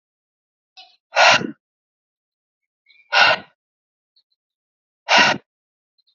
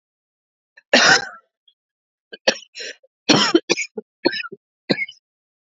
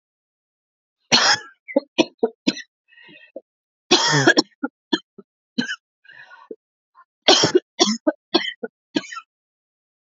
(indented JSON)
{
  "exhalation_length": "6.1 s",
  "exhalation_amplitude": 28678,
  "exhalation_signal_mean_std_ratio": 0.28,
  "cough_length": "5.6 s",
  "cough_amplitude": 30517,
  "cough_signal_mean_std_ratio": 0.33,
  "three_cough_length": "10.2 s",
  "three_cough_amplitude": 32223,
  "three_cough_signal_mean_std_ratio": 0.33,
  "survey_phase": "alpha (2021-03-01 to 2021-08-12)",
  "age": "18-44",
  "gender": "Female",
  "wearing_mask": "No",
  "symptom_cough_any": true,
  "symptom_headache": true,
  "symptom_onset": "3 days",
  "smoker_status": "Ex-smoker",
  "respiratory_condition_asthma": false,
  "respiratory_condition_other": false,
  "recruitment_source": "Test and Trace",
  "submission_delay": "2 days",
  "covid_test_result": "Positive",
  "covid_test_method": "RT-qPCR"
}